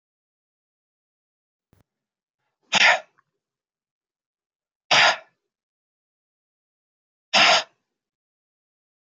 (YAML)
exhalation_length: 9.0 s
exhalation_amplitude: 22740
exhalation_signal_mean_std_ratio: 0.23
survey_phase: beta (2021-08-13 to 2022-03-07)
age: 65+
gender: Male
wearing_mask: 'No'
symptom_cough_any: true
symptom_shortness_of_breath: true
symptom_fatigue: true
symptom_change_to_sense_of_smell_or_taste: true
symptom_other: true
symptom_onset: 4 days
smoker_status: Never smoked
respiratory_condition_asthma: true
respiratory_condition_other: false
recruitment_source: Test and Trace
submission_delay: 1 day
covid_test_result: Positive
covid_test_method: RT-qPCR
covid_ct_value: 16.3
covid_ct_gene: ORF1ab gene
covid_ct_mean: 16.4
covid_viral_load: 4000000 copies/ml
covid_viral_load_category: High viral load (>1M copies/ml)